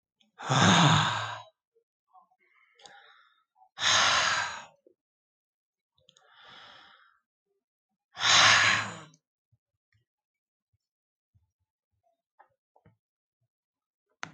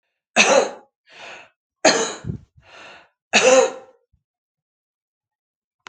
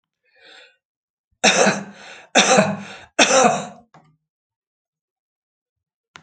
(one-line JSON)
{"exhalation_length": "14.3 s", "exhalation_amplitude": 13372, "exhalation_signal_mean_std_ratio": 0.32, "three_cough_length": "5.9 s", "three_cough_amplitude": 32767, "three_cough_signal_mean_std_ratio": 0.34, "cough_length": "6.2 s", "cough_amplitude": 32768, "cough_signal_mean_std_ratio": 0.36, "survey_phase": "alpha (2021-03-01 to 2021-08-12)", "age": "65+", "gender": "Female", "wearing_mask": "No", "symptom_none": true, "smoker_status": "Ex-smoker", "respiratory_condition_asthma": false, "respiratory_condition_other": false, "recruitment_source": "REACT", "submission_delay": "1 day", "covid_test_result": "Negative", "covid_test_method": "RT-qPCR"}